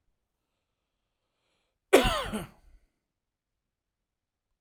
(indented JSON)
{
  "cough_length": "4.6 s",
  "cough_amplitude": 21230,
  "cough_signal_mean_std_ratio": 0.2,
  "survey_phase": "alpha (2021-03-01 to 2021-08-12)",
  "age": "18-44",
  "gender": "Male",
  "wearing_mask": "No",
  "symptom_none": true,
  "smoker_status": "Never smoked",
  "respiratory_condition_asthma": false,
  "respiratory_condition_other": false,
  "recruitment_source": "REACT",
  "submission_delay": "2 days",
  "covid_test_result": "Negative",
  "covid_test_method": "RT-qPCR"
}